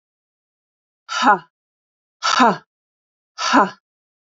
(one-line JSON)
{"exhalation_length": "4.3 s", "exhalation_amplitude": 28071, "exhalation_signal_mean_std_ratio": 0.33, "survey_phase": "alpha (2021-03-01 to 2021-08-12)", "age": "45-64", "gender": "Female", "wearing_mask": "No", "symptom_none": true, "smoker_status": "Ex-smoker", "respiratory_condition_asthma": false, "respiratory_condition_other": false, "recruitment_source": "REACT", "submission_delay": "2 days", "covid_test_result": "Negative", "covid_test_method": "RT-qPCR"}